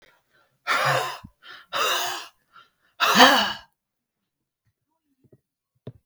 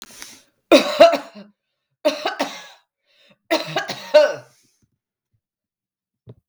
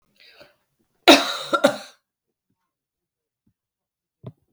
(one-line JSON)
{"exhalation_length": "6.1 s", "exhalation_amplitude": 32768, "exhalation_signal_mean_std_ratio": 0.35, "three_cough_length": "6.5 s", "three_cough_amplitude": 32768, "three_cough_signal_mean_std_ratio": 0.31, "cough_length": "4.5 s", "cough_amplitude": 32768, "cough_signal_mean_std_ratio": 0.21, "survey_phase": "beta (2021-08-13 to 2022-03-07)", "age": "45-64", "gender": "Female", "wearing_mask": "No", "symptom_none": true, "smoker_status": "Never smoked", "respiratory_condition_asthma": false, "respiratory_condition_other": false, "recruitment_source": "REACT", "submission_delay": "1 day", "covid_test_result": "Negative", "covid_test_method": "RT-qPCR"}